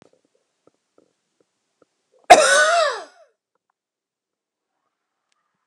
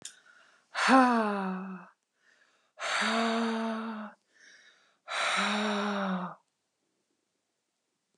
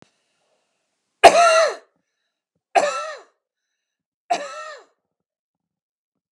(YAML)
cough_length: 5.7 s
cough_amplitude: 32768
cough_signal_mean_std_ratio: 0.25
exhalation_length: 8.2 s
exhalation_amplitude: 13209
exhalation_signal_mean_std_ratio: 0.5
three_cough_length: 6.3 s
three_cough_amplitude: 32768
three_cough_signal_mean_std_ratio: 0.27
survey_phase: alpha (2021-03-01 to 2021-08-12)
age: 45-64
gender: Female
wearing_mask: 'No'
symptom_none: true
smoker_status: Ex-smoker
respiratory_condition_asthma: false
respiratory_condition_other: false
recruitment_source: REACT
submission_delay: 1 day
covid_test_result: Negative
covid_test_method: RT-qPCR